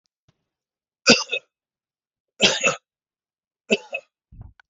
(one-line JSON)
{"three_cough_length": "4.7 s", "three_cough_amplitude": 29434, "three_cough_signal_mean_std_ratio": 0.26, "survey_phase": "beta (2021-08-13 to 2022-03-07)", "age": "45-64", "gender": "Male", "wearing_mask": "No", "symptom_cough_any": true, "symptom_runny_or_blocked_nose": true, "symptom_sore_throat": true, "symptom_onset": "8 days", "smoker_status": "Ex-smoker", "respiratory_condition_asthma": false, "respiratory_condition_other": false, "recruitment_source": "REACT", "submission_delay": "1 day", "covid_test_result": "Negative", "covid_test_method": "RT-qPCR"}